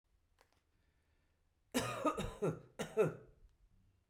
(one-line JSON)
{"cough_length": "4.1 s", "cough_amplitude": 2681, "cough_signal_mean_std_ratio": 0.38, "survey_phase": "beta (2021-08-13 to 2022-03-07)", "age": "65+", "gender": "Female", "wearing_mask": "No", "symptom_runny_or_blocked_nose": true, "symptom_onset": "9 days", "smoker_status": "Never smoked", "respiratory_condition_asthma": false, "respiratory_condition_other": false, "recruitment_source": "REACT", "submission_delay": "1 day", "covid_test_result": "Negative", "covid_test_method": "RT-qPCR"}